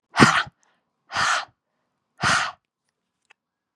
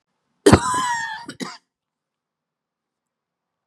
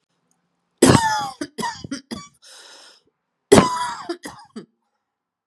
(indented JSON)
{
  "exhalation_length": "3.8 s",
  "exhalation_amplitude": 31837,
  "exhalation_signal_mean_std_ratio": 0.34,
  "cough_length": "3.7 s",
  "cough_amplitude": 32768,
  "cough_signal_mean_std_ratio": 0.28,
  "three_cough_length": "5.5 s",
  "three_cough_amplitude": 32768,
  "three_cough_signal_mean_std_ratio": 0.33,
  "survey_phase": "beta (2021-08-13 to 2022-03-07)",
  "age": "45-64",
  "gender": "Female",
  "wearing_mask": "No",
  "symptom_cough_any": true,
  "smoker_status": "Never smoked",
  "respiratory_condition_asthma": false,
  "respiratory_condition_other": false,
  "recruitment_source": "REACT",
  "submission_delay": "1 day",
  "covid_test_result": "Negative",
  "covid_test_method": "RT-qPCR",
  "covid_ct_value": 38.8,
  "covid_ct_gene": "E gene",
  "influenza_a_test_result": "Negative",
  "influenza_b_test_result": "Negative"
}